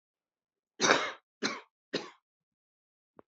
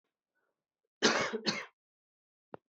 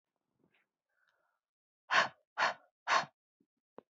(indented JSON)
{
  "three_cough_length": "3.3 s",
  "three_cough_amplitude": 15251,
  "three_cough_signal_mean_std_ratio": 0.28,
  "cough_length": "2.7 s",
  "cough_amplitude": 10626,
  "cough_signal_mean_std_ratio": 0.32,
  "exhalation_length": "3.9 s",
  "exhalation_amplitude": 6156,
  "exhalation_signal_mean_std_ratio": 0.27,
  "survey_phase": "beta (2021-08-13 to 2022-03-07)",
  "age": "45-64",
  "gender": "Female",
  "wearing_mask": "No",
  "symptom_cough_any": true,
  "symptom_runny_or_blocked_nose": true,
  "symptom_shortness_of_breath": true,
  "symptom_sore_throat": true,
  "symptom_abdominal_pain": true,
  "symptom_fatigue": true,
  "symptom_change_to_sense_of_smell_or_taste": true,
  "symptom_loss_of_taste": true,
  "symptom_onset": "4 days",
  "smoker_status": "Ex-smoker",
  "respiratory_condition_asthma": false,
  "respiratory_condition_other": false,
  "recruitment_source": "Test and Trace",
  "submission_delay": "3 days",
  "covid_test_result": "Positive",
  "covid_test_method": "ePCR"
}